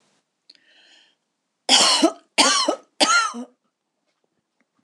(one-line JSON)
{"three_cough_length": "4.8 s", "three_cough_amplitude": 25927, "three_cough_signal_mean_std_ratio": 0.39, "survey_phase": "beta (2021-08-13 to 2022-03-07)", "age": "65+", "gender": "Female", "wearing_mask": "No", "symptom_runny_or_blocked_nose": true, "symptom_sore_throat": true, "symptom_fatigue": true, "symptom_headache": true, "symptom_other": true, "symptom_onset": "4 days", "smoker_status": "Never smoked", "respiratory_condition_asthma": false, "respiratory_condition_other": false, "recruitment_source": "Test and Trace", "submission_delay": "0 days", "covid_test_result": "Positive", "covid_test_method": "RT-qPCR", "covid_ct_value": 14.3, "covid_ct_gene": "ORF1ab gene", "covid_ct_mean": 14.7, "covid_viral_load": "15000000 copies/ml", "covid_viral_load_category": "High viral load (>1M copies/ml)"}